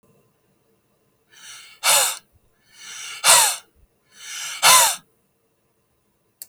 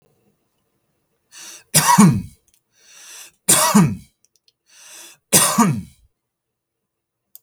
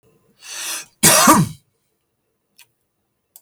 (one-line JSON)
{"exhalation_length": "6.5 s", "exhalation_amplitude": 32768, "exhalation_signal_mean_std_ratio": 0.33, "three_cough_length": "7.4 s", "three_cough_amplitude": 32768, "three_cough_signal_mean_std_ratio": 0.35, "cough_length": "3.4 s", "cough_amplitude": 32768, "cough_signal_mean_std_ratio": 0.33, "survey_phase": "beta (2021-08-13 to 2022-03-07)", "age": "45-64", "gender": "Male", "wearing_mask": "No", "symptom_none": true, "smoker_status": "Never smoked", "respiratory_condition_asthma": false, "respiratory_condition_other": false, "recruitment_source": "REACT", "submission_delay": "3 days", "covid_test_result": "Negative", "covid_test_method": "RT-qPCR", "influenza_a_test_result": "Negative", "influenza_b_test_result": "Negative"}